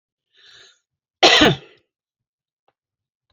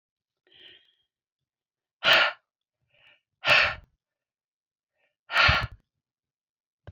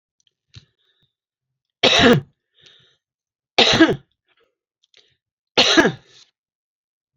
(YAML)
cough_length: 3.3 s
cough_amplitude: 29410
cough_signal_mean_std_ratio: 0.25
exhalation_length: 6.9 s
exhalation_amplitude: 17267
exhalation_signal_mean_std_ratio: 0.28
three_cough_length: 7.2 s
three_cough_amplitude: 32767
three_cough_signal_mean_std_ratio: 0.31
survey_phase: beta (2021-08-13 to 2022-03-07)
age: 65+
gender: Female
wearing_mask: 'No'
symptom_none: true
smoker_status: Ex-smoker
respiratory_condition_asthma: false
respiratory_condition_other: false
recruitment_source: REACT
submission_delay: 1 day
covid_test_result: Negative
covid_test_method: RT-qPCR